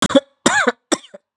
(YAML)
three_cough_length: 1.4 s
three_cough_amplitude: 32767
three_cough_signal_mean_std_ratio: 0.44
survey_phase: beta (2021-08-13 to 2022-03-07)
age: 45-64
gender: Female
wearing_mask: 'Yes'
symptom_cough_any: true
symptom_runny_or_blocked_nose: true
symptom_sore_throat: true
symptom_fatigue: true
symptom_fever_high_temperature: true
symptom_headache: true
smoker_status: Never smoked
respiratory_condition_asthma: false
respiratory_condition_other: false
recruitment_source: Test and Trace
submission_delay: 2 days
covid_test_result: Positive
covid_test_method: RT-qPCR
covid_ct_value: 19.4
covid_ct_gene: ORF1ab gene
covid_ct_mean: 19.7
covid_viral_load: 360000 copies/ml
covid_viral_load_category: Low viral load (10K-1M copies/ml)